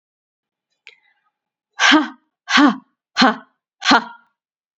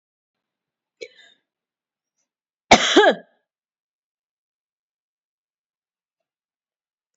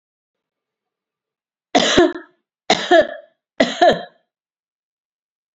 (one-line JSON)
{"exhalation_length": "4.8 s", "exhalation_amplitude": 29729, "exhalation_signal_mean_std_ratio": 0.34, "cough_length": "7.2 s", "cough_amplitude": 29956, "cough_signal_mean_std_ratio": 0.18, "three_cough_length": "5.5 s", "three_cough_amplitude": 32768, "three_cough_signal_mean_std_ratio": 0.33, "survey_phase": "beta (2021-08-13 to 2022-03-07)", "age": "45-64", "gender": "Female", "wearing_mask": "No", "symptom_none": true, "symptom_onset": "7 days", "smoker_status": "Never smoked", "respiratory_condition_asthma": false, "respiratory_condition_other": false, "recruitment_source": "REACT", "submission_delay": "1 day", "covid_test_result": "Negative", "covid_test_method": "RT-qPCR", "influenza_a_test_result": "Negative", "influenza_b_test_result": "Negative"}